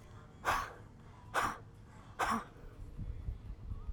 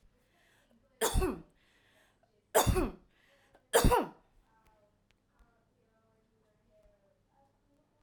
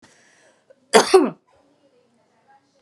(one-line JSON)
{"exhalation_length": "3.9 s", "exhalation_amplitude": 3560, "exhalation_signal_mean_std_ratio": 0.63, "three_cough_length": "8.0 s", "three_cough_amplitude": 9099, "three_cough_signal_mean_std_ratio": 0.28, "cough_length": "2.8 s", "cough_amplitude": 32766, "cough_signal_mean_std_ratio": 0.25, "survey_phase": "alpha (2021-03-01 to 2021-08-12)", "age": "45-64", "gender": "Female", "wearing_mask": "No", "symptom_fatigue": true, "symptom_onset": "4 days", "smoker_status": "Ex-smoker", "respiratory_condition_asthma": false, "respiratory_condition_other": false, "recruitment_source": "REACT", "submission_delay": "1 day", "covid_test_result": "Negative", "covid_test_method": "RT-qPCR"}